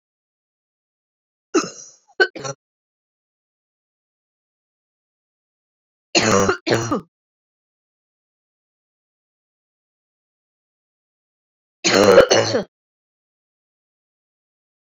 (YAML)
three_cough_length: 14.9 s
three_cough_amplitude: 29068
three_cough_signal_mean_std_ratio: 0.25
survey_phase: beta (2021-08-13 to 2022-03-07)
age: 45-64
gender: Female
wearing_mask: 'No'
symptom_cough_any: true
symptom_new_continuous_cough: true
symptom_runny_or_blocked_nose: true
symptom_sore_throat: true
symptom_fatigue: true
symptom_fever_high_temperature: true
symptom_headache: true
symptom_change_to_sense_of_smell_or_taste: true
symptom_onset: 5 days
smoker_status: Never smoked
respiratory_condition_asthma: false
respiratory_condition_other: false
recruitment_source: Test and Trace
submission_delay: 2 days
covid_test_result: Positive
covid_test_method: RT-qPCR
covid_ct_value: 14.5
covid_ct_gene: ORF1ab gene
covid_ct_mean: 15.0
covid_viral_load: 12000000 copies/ml
covid_viral_load_category: High viral load (>1M copies/ml)